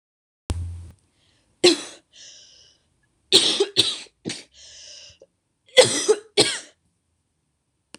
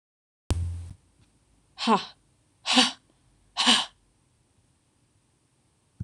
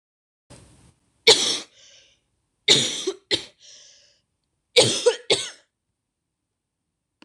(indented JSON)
{
  "cough_length": "8.0 s",
  "cough_amplitude": 26028,
  "cough_signal_mean_std_ratio": 0.31,
  "exhalation_length": "6.0 s",
  "exhalation_amplitude": 22568,
  "exhalation_signal_mean_std_ratio": 0.32,
  "three_cough_length": "7.2 s",
  "three_cough_amplitude": 26028,
  "three_cough_signal_mean_std_ratio": 0.3,
  "survey_phase": "beta (2021-08-13 to 2022-03-07)",
  "age": "18-44",
  "gender": "Female",
  "wearing_mask": "No",
  "symptom_cough_any": true,
  "symptom_new_continuous_cough": true,
  "symptom_runny_or_blocked_nose": true,
  "symptom_shortness_of_breath": true,
  "symptom_sore_throat": true,
  "symptom_fatigue": true,
  "symptom_fever_high_temperature": true,
  "symptom_headache": true,
  "symptom_onset": "4 days",
  "smoker_status": "Never smoked",
  "respiratory_condition_asthma": false,
  "respiratory_condition_other": false,
  "recruitment_source": "Test and Trace",
  "submission_delay": "1 day",
  "covid_test_result": "Positive",
  "covid_test_method": "RT-qPCR",
  "covid_ct_value": 27.6,
  "covid_ct_gene": "ORF1ab gene",
  "covid_ct_mean": 27.9,
  "covid_viral_load": "720 copies/ml",
  "covid_viral_load_category": "Minimal viral load (< 10K copies/ml)"
}